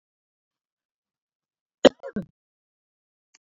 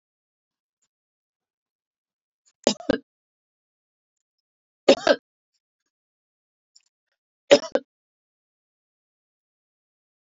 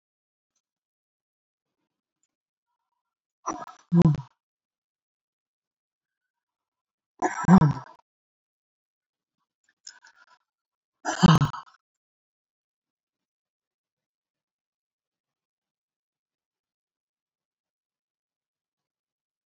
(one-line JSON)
{"cough_length": "3.4 s", "cough_amplitude": 27551, "cough_signal_mean_std_ratio": 0.1, "three_cough_length": "10.2 s", "three_cough_amplitude": 28601, "three_cough_signal_mean_std_ratio": 0.14, "exhalation_length": "19.5 s", "exhalation_amplitude": 19062, "exhalation_signal_mean_std_ratio": 0.17, "survey_phase": "beta (2021-08-13 to 2022-03-07)", "age": "65+", "gender": "Female", "wearing_mask": "No", "symptom_runny_or_blocked_nose": true, "symptom_sore_throat": true, "symptom_fatigue": true, "symptom_headache": true, "symptom_onset": "12 days", "smoker_status": "Ex-smoker", "respiratory_condition_asthma": false, "respiratory_condition_other": true, "recruitment_source": "REACT", "submission_delay": "2 days", "covid_test_result": "Negative", "covid_test_method": "RT-qPCR", "influenza_a_test_result": "Negative", "influenza_b_test_result": "Negative"}